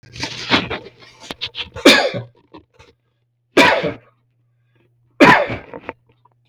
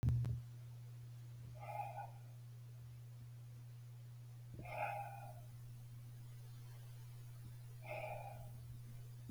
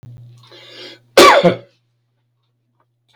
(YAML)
three_cough_length: 6.5 s
three_cough_amplitude: 32768
three_cough_signal_mean_std_ratio: 0.36
exhalation_length: 9.3 s
exhalation_amplitude: 1664
exhalation_signal_mean_std_ratio: 0.86
cough_length: 3.2 s
cough_amplitude: 32768
cough_signal_mean_std_ratio: 0.31
survey_phase: beta (2021-08-13 to 2022-03-07)
age: 65+
gender: Male
wearing_mask: 'No'
symptom_none: true
smoker_status: Ex-smoker
respiratory_condition_asthma: false
respiratory_condition_other: false
recruitment_source: REACT
submission_delay: 3 days
covid_test_result: Negative
covid_test_method: RT-qPCR
influenza_a_test_result: Negative
influenza_b_test_result: Negative